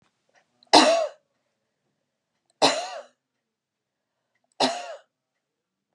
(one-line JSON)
{"three_cough_length": "5.9 s", "three_cough_amplitude": 29753, "three_cough_signal_mean_std_ratio": 0.26, "survey_phase": "beta (2021-08-13 to 2022-03-07)", "age": "45-64", "gender": "Female", "wearing_mask": "No", "symptom_none": true, "smoker_status": "Ex-smoker", "respiratory_condition_asthma": false, "respiratory_condition_other": false, "recruitment_source": "REACT", "submission_delay": "3 days", "covid_test_result": "Negative", "covid_test_method": "RT-qPCR", "influenza_a_test_result": "Negative", "influenza_b_test_result": "Negative"}